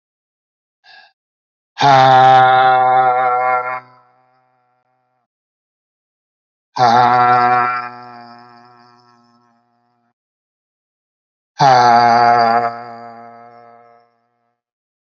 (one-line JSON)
{"exhalation_length": "15.2 s", "exhalation_amplitude": 29346, "exhalation_signal_mean_std_ratio": 0.46, "survey_phase": "alpha (2021-03-01 to 2021-08-12)", "age": "45-64", "gender": "Male", "wearing_mask": "No", "symptom_none": true, "smoker_status": "Current smoker (11 or more cigarettes per day)", "respiratory_condition_asthma": false, "respiratory_condition_other": false, "recruitment_source": "REACT", "submission_delay": "1 day", "covid_test_result": "Negative", "covid_test_method": "RT-qPCR"}